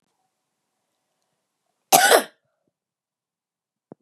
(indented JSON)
{
  "cough_length": "4.0 s",
  "cough_amplitude": 32767,
  "cough_signal_mean_std_ratio": 0.21,
  "survey_phase": "beta (2021-08-13 to 2022-03-07)",
  "age": "45-64",
  "gender": "Female",
  "wearing_mask": "No",
  "symptom_runny_or_blocked_nose": true,
  "symptom_headache": true,
  "symptom_other": true,
  "symptom_onset": "3 days",
  "smoker_status": "Never smoked",
  "respiratory_condition_asthma": false,
  "respiratory_condition_other": false,
  "recruitment_source": "Test and Trace",
  "submission_delay": "1 day",
  "covid_test_result": "Positive",
  "covid_test_method": "RT-qPCR",
  "covid_ct_value": 12.5,
  "covid_ct_gene": "ORF1ab gene",
  "covid_ct_mean": 14.0,
  "covid_viral_load": "26000000 copies/ml",
  "covid_viral_load_category": "High viral load (>1M copies/ml)"
}